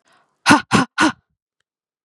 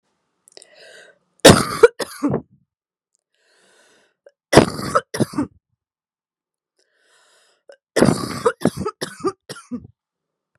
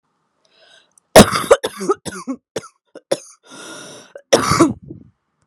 {"exhalation_length": "2.0 s", "exhalation_amplitude": 32767, "exhalation_signal_mean_std_ratio": 0.35, "three_cough_length": "10.6 s", "three_cough_amplitude": 32768, "three_cough_signal_mean_std_ratio": 0.27, "cough_length": "5.5 s", "cough_amplitude": 32768, "cough_signal_mean_std_ratio": 0.31, "survey_phase": "beta (2021-08-13 to 2022-03-07)", "age": "45-64", "gender": "Female", "wearing_mask": "No", "symptom_cough_any": true, "symptom_new_continuous_cough": true, "symptom_runny_or_blocked_nose": true, "symptom_shortness_of_breath": true, "symptom_sore_throat": true, "symptom_fatigue": true, "symptom_headache": true, "symptom_onset": "9 days", "smoker_status": "Never smoked", "respiratory_condition_asthma": false, "respiratory_condition_other": false, "recruitment_source": "REACT", "submission_delay": "1 day", "covid_test_result": "Positive", "covid_test_method": "RT-qPCR", "covid_ct_value": 22.0, "covid_ct_gene": "E gene", "influenza_a_test_result": "Negative", "influenza_b_test_result": "Negative"}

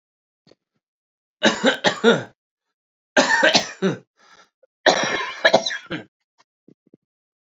{"three_cough_length": "7.5 s", "three_cough_amplitude": 30229, "three_cough_signal_mean_std_ratio": 0.38, "survey_phase": "beta (2021-08-13 to 2022-03-07)", "age": "18-44", "gender": "Male", "wearing_mask": "No", "symptom_cough_any": true, "symptom_runny_or_blocked_nose": true, "symptom_abdominal_pain": true, "symptom_fatigue": true, "symptom_fever_high_temperature": true, "symptom_headache": true, "symptom_change_to_sense_of_smell_or_taste": true, "symptom_loss_of_taste": true, "symptom_onset": "4 days", "smoker_status": "Never smoked", "respiratory_condition_asthma": true, "respiratory_condition_other": false, "recruitment_source": "Test and Trace", "submission_delay": "1 day", "covid_test_result": "Positive", "covid_test_method": "RT-qPCR", "covid_ct_value": 21.8, "covid_ct_gene": "ORF1ab gene", "covid_ct_mean": 22.2, "covid_viral_load": "52000 copies/ml", "covid_viral_load_category": "Low viral load (10K-1M copies/ml)"}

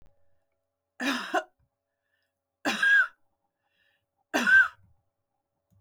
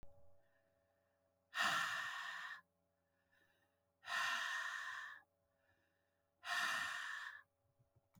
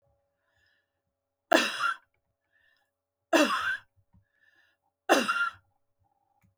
{"cough_length": "5.8 s", "cough_amplitude": 10722, "cough_signal_mean_std_ratio": 0.33, "exhalation_length": "8.2 s", "exhalation_amplitude": 1788, "exhalation_signal_mean_std_ratio": 0.52, "three_cough_length": "6.6 s", "three_cough_amplitude": 15754, "three_cough_signal_mean_std_ratio": 0.32, "survey_phase": "beta (2021-08-13 to 2022-03-07)", "age": "45-64", "gender": "Female", "wearing_mask": "No", "symptom_sore_throat": true, "smoker_status": "Never smoked", "respiratory_condition_asthma": false, "respiratory_condition_other": false, "recruitment_source": "REACT", "submission_delay": "2 days", "covid_test_result": "Negative", "covid_test_method": "RT-qPCR", "influenza_a_test_result": "Unknown/Void", "influenza_b_test_result": "Unknown/Void"}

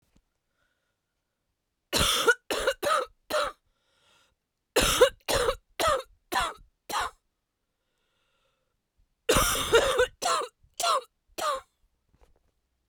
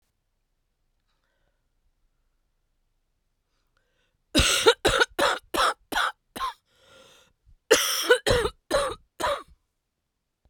{"three_cough_length": "12.9 s", "three_cough_amplitude": 17079, "three_cough_signal_mean_std_ratio": 0.42, "cough_length": "10.5 s", "cough_amplitude": 23052, "cough_signal_mean_std_ratio": 0.36, "survey_phase": "beta (2021-08-13 to 2022-03-07)", "age": "18-44", "gender": "Female", "wearing_mask": "No", "symptom_cough_any": true, "symptom_runny_or_blocked_nose": true, "symptom_sore_throat": true, "symptom_diarrhoea": true, "symptom_fatigue": true, "symptom_headache": true, "symptom_other": true, "symptom_onset": "4 days", "smoker_status": "Ex-smoker", "respiratory_condition_asthma": false, "respiratory_condition_other": false, "recruitment_source": "Test and Trace", "submission_delay": "1 day", "covid_test_result": "Negative", "covid_test_method": "RT-qPCR"}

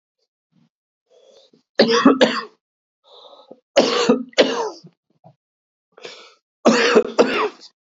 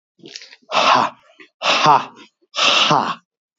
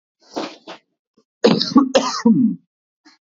{"three_cough_length": "7.9 s", "three_cough_amplitude": 32272, "three_cough_signal_mean_std_ratio": 0.4, "exhalation_length": "3.6 s", "exhalation_amplitude": 27932, "exhalation_signal_mean_std_ratio": 0.52, "cough_length": "3.2 s", "cough_amplitude": 31629, "cough_signal_mean_std_ratio": 0.44, "survey_phase": "beta (2021-08-13 to 2022-03-07)", "age": "18-44", "gender": "Male", "wearing_mask": "No", "symptom_new_continuous_cough": true, "symptom_shortness_of_breath": true, "symptom_fever_high_temperature": true, "symptom_headache": true, "symptom_onset": "3 days", "smoker_status": "Never smoked", "respiratory_condition_asthma": false, "respiratory_condition_other": false, "recruitment_source": "Test and Trace", "submission_delay": "2 days", "covid_test_result": "Positive", "covid_test_method": "RT-qPCR", "covid_ct_value": 15.0, "covid_ct_gene": "ORF1ab gene", "covid_ct_mean": 15.3, "covid_viral_load": "9300000 copies/ml", "covid_viral_load_category": "High viral load (>1M copies/ml)"}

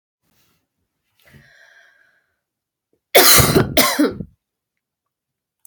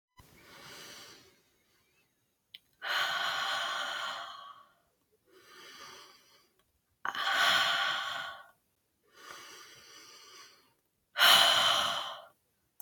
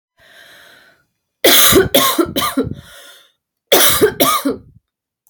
{"three_cough_length": "5.7 s", "three_cough_amplitude": 32768, "three_cough_signal_mean_std_ratio": 0.31, "exhalation_length": "12.8 s", "exhalation_amplitude": 12997, "exhalation_signal_mean_std_ratio": 0.42, "cough_length": "5.3 s", "cough_amplitude": 32768, "cough_signal_mean_std_ratio": 0.49, "survey_phase": "beta (2021-08-13 to 2022-03-07)", "age": "18-44", "gender": "Female", "wearing_mask": "No", "symptom_cough_any": true, "symptom_shortness_of_breath": true, "symptom_onset": "9 days", "smoker_status": "Never smoked", "respiratory_condition_asthma": false, "respiratory_condition_other": false, "recruitment_source": "REACT", "submission_delay": "3 days", "covid_test_result": "Positive", "covid_test_method": "RT-qPCR", "covid_ct_value": 24.0, "covid_ct_gene": "N gene"}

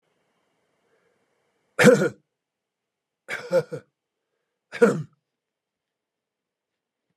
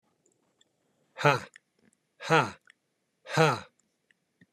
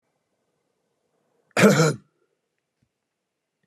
{"three_cough_length": "7.2 s", "three_cough_amplitude": 27830, "three_cough_signal_mean_std_ratio": 0.23, "exhalation_length": "4.5 s", "exhalation_amplitude": 15425, "exhalation_signal_mean_std_ratio": 0.28, "cough_length": "3.7 s", "cough_amplitude": 24415, "cough_signal_mean_std_ratio": 0.25, "survey_phase": "beta (2021-08-13 to 2022-03-07)", "age": "45-64", "gender": "Male", "wearing_mask": "No", "symptom_none": true, "smoker_status": "Never smoked", "respiratory_condition_asthma": false, "respiratory_condition_other": false, "recruitment_source": "REACT", "submission_delay": "1 day", "covid_test_result": "Negative", "covid_test_method": "RT-qPCR", "influenza_a_test_result": "Negative", "influenza_b_test_result": "Negative"}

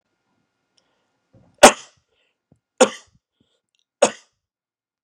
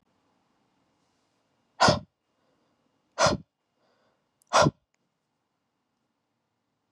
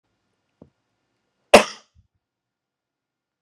{"three_cough_length": "5.0 s", "three_cough_amplitude": 32768, "three_cough_signal_mean_std_ratio": 0.15, "exhalation_length": "6.9 s", "exhalation_amplitude": 14282, "exhalation_signal_mean_std_ratio": 0.21, "cough_length": "3.4 s", "cough_amplitude": 32768, "cough_signal_mean_std_ratio": 0.12, "survey_phase": "alpha (2021-03-01 to 2021-08-12)", "age": "18-44", "gender": "Male", "wearing_mask": "No", "symptom_none": true, "smoker_status": "Never smoked", "respiratory_condition_asthma": false, "respiratory_condition_other": false, "recruitment_source": "REACT", "submission_delay": "2 days", "covid_test_result": "Negative", "covid_test_method": "RT-qPCR"}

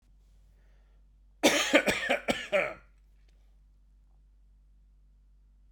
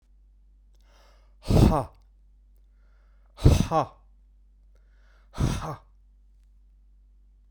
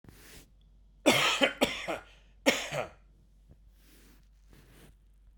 {"cough_length": "5.7 s", "cough_amplitude": 13495, "cough_signal_mean_std_ratio": 0.34, "exhalation_length": "7.5 s", "exhalation_amplitude": 21618, "exhalation_signal_mean_std_ratio": 0.3, "three_cough_length": "5.4 s", "three_cough_amplitude": 13464, "three_cough_signal_mean_std_ratio": 0.36, "survey_phase": "beta (2021-08-13 to 2022-03-07)", "age": "45-64", "gender": "Male", "wearing_mask": "No", "symptom_none": true, "smoker_status": "Never smoked", "respiratory_condition_asthma": false, "respiratory_condition_other": false, "recruitment_source": "REACT", "submission_delay": "1 day", "covid_test_result": "Negative", "covid_test_method": "RT-qPCR"}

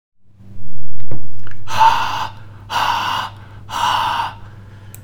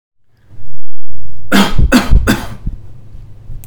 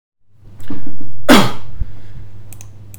{"exhalation_length": "5.0 s", "exhalation_amplitude": 32767, "exhalation_signal_mean_std_ratio": 0.7, "three_cough_length": "3.7 s", "three_cough_amplitude": 32768, "three_cough_signal_mean_std_ratio": 0.82, "cough_length": "3.0 s", "cough_amplitude": 32768, "cough_signal_mean_std_ratio": 0.88, "survey_phase": "alpha (2021-03-01 to 2021-08-12)", "age": "18-44", "gender": "Male", "wearing_mask": "No", "symptom_none": true, "smoker_status": "Ex-smoker", "respiratory_condition_asthma": false, "respiratory_condition_other": false, "recruitment_source": "REACT", "submission_delay": "6 days", "covid_test_result": "Negative", "covid_test_method": "RT-qPCR"}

